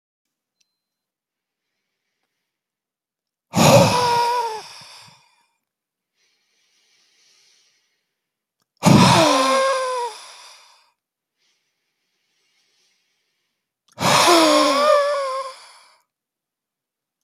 exhalation_length: 17.2 s
exhalation_amplitude: 29490
exhalation_signal_mean_std_ratio: 0.38
survey_phase: alpha (2021-03-01 to 2021-08-12)
age: 65+
gender: Male
wearing_mask: 'No'
symptom_none: true
smoker_status: Never smoked
respiratory_condition_asthma: false
respiratory_condition_other: false
recruitment_source: REACT
submission_delay: 2 days
covid_test_result: Negative
covid_test_method: RT-qPCR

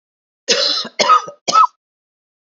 three_cough_length: 2.5 s
three_cough_amplitude: 30624
three_cough_signal_mean_std_ratio: 0.45
survey_phase: beta (2021-08-13 to 2022-03-07)
age: 45-64
gender: Female
wearing_mask: 'No'
symptom_new_continuous_cough: true
symptom_sore_throat: true
symptom_fatigue: true
symptom_fever_high_temperature: true
symptom_onset: 2 days
smoker_status: Ex-smoker
respiratory_condition_asthma: false
respiratory_condition_other: false
recruitment_source: Test and Trace
submission_delay: 1 day
covid_test_result: Positive
covid_test_method: RT-qPCR
covid_ct_value: 27.3
covid_ct_gene: ORF1ab gene
covid_ct_mean: 27.3
covid_viral_load: 1100 copies/ml
covid_viral_load_category: Minimal viral load (< 10K copies/ml)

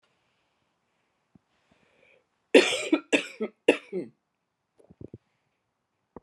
cough_length: 6.2 s
cough_amplitude: 23509
cough_signal_mean_std_ratio: 0.22
survey_phase: beta (2021-08-13 to 2022-03-07)
age: 18-44
gender: Female
wearing_mask: 'No'
symptom_cough_any: true
symptom_sore_throat: true
symptom_fatigue: true
symptom_onset: 3 days
smoker_status: Never smoked
respiratory_condition_asthma: false
respiratory_condition_other: false
recruitment_source: Test and Trace
submission_delay: 2 days
covid_test_result: Positive
covid_test_method: RT-qPCR
covid_ct_value: 28.9
covid_ct_gene: N gene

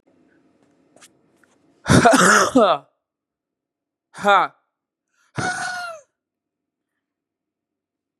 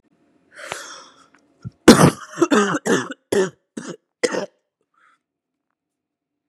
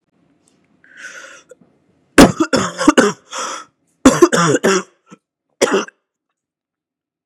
exhalation_length: 8.2 s
exhalation_amplitude: 32761
exhalation_signal_mean_std_ratio: 0.32
cough_length: 6.5 s
cough_amplitude: 32768
cough_signal_mean_std_ratio: 0.3
three_cough_length: 7.3 s
three_cough_amplitude: 32768
three_cough_signal_mean_std_ratio: 0.35
survey_phase: beta (2021-08-13 to 2022-03-07)
age: 18-44
gender: Male
wearing_mask: 'No'
symptom_cough_any: true
symptom_runny_or_blocked_nose: true
symptom_sore_throat: true
symptom_onset: 5 days
smoker_status: Never smoked
respiratory_condition_asthma: false
respiratory_condition_other: false
recruitment_source: Test and Trace
submission_delay: 2 days
covid_test_result: Positive
covid_test_method: RT-qPCR
covid_ct_value: 28.2
covid_ct_gene: N gene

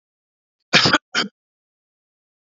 cough_length: 2.5 s
cough_amplitude: 27428
cough_signal_mean_std_ratio: 0.28
survey_phase: beta (2021-08-13 to 2022-03-07)
age: 65+
gender: Male
wearing_mask: 'No'
symptom_none: true
smoker_status: Never smoked
respiratory_condition_asthma: false
respiratory_condition_other: false
recruitment_source: REACT
submission_delay: 2 days
covid_test_result: Negative
covid_test_method: RT-qPCR
influenza_a_test_result: Negative
influenza_b_test_result: Negative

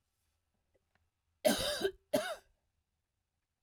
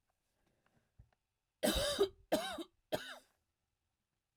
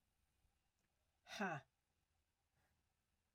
cough_length: 3.6 s
cough_amplitude: 5060
cough_signal_mean_std_ratio: 0.32
three_cough_length: 4.4 s
three_cough_amplitude: 3123
three_cough_signal_mean_std_ratio: 0.34
exhalation_length: 3.3 s
exhalation_amplitude: 684
exhalation_signal_mean_std_ratio: 0.25
survey_phase: alpha (2021-03-01 to 2021-08-12)
age: 45-64
gender: Female
wearing_mask: 'No'
symptom_cough_any: true
symptom_fatigue: true
symptom_fever_high_temperature: true
symptom_headache: true
smoker_status: Never smoked
respiratory_condition_asthma: true
respiratory_condition_other: false
recruitment_source: Test and Trace
submission_delay: 2 days
covid_test_result: Positive
covid_test_method: RT-qPCR
covid_ct_value: 32.1
covid_ct_gene: N gene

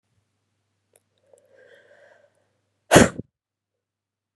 exhalation_length: 4.4 s
exhalation_amplitude: 32767
exhalation_signal_mean_std_ratio: 0.15
survey_phase: beta (2021-08-13 to 2022-03-07)
age: 18-44
gender: Female
wearing_mask: 'No'
symptom_cough_any: true
symptom_runny_or_blocked_nose: true
symptom_shortness_of_breath: true
symptom_sore_throat: true
symptom_abdominal_pain: true
symptom_fatigue: true
symptom_headache: true
symptom_change_to_sense_of_smell_or_taste: true
symptom_loss_of_taste: true
symptom_onset: 4 days
smoker_status: Current smoker (1 to 10 cigarettes per day)
respiratory_condition_asthma: true
respiratory_condition_other: false
recruitment_source: Test and Trace
submission_delay: 2 days
covid_test_result: Positive
covid_test_method: RT-qPCR
covid_ct_value: 16.8
covid_ct_gene: N gene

